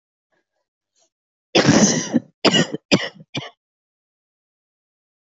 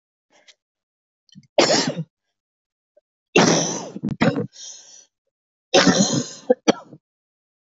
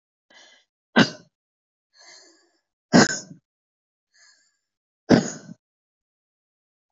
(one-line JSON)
{"cough_length": "5.2 s", "cough_amplitude": 27624, "cough_signal_mean_std_ratio": 0.34, "three_cough_length": "7.8 s", "three_cough_amplitude": 26553, "three_cough_signal_mean_std_ratio": 0.37, "exhalation_length": "6.9 s", "exhalation_amplitude": 27928, "exhalation_signal_mean_std_ratio": 0.2, "survey_phase": "alpha (2021-03-01 to 2021-08-12)", "age": "18-44", "gender": "Female", "wearing_mask": "No", "symptom_cough_any": true, "symptom_abdominal_pain": true, "symptom_fatigue": true, "symptom_fever_high_temperature": true, "symptom_onset": "8 days", "smoker_status": "Never smoked", "respiratory_condition_asthma": false, "respiratory_condition_other": false, "recruitment_source": "REACT", "submission_delay": "1 day", "covid_test_result": "Negative", "covid_test_method": "RT-qPCR"}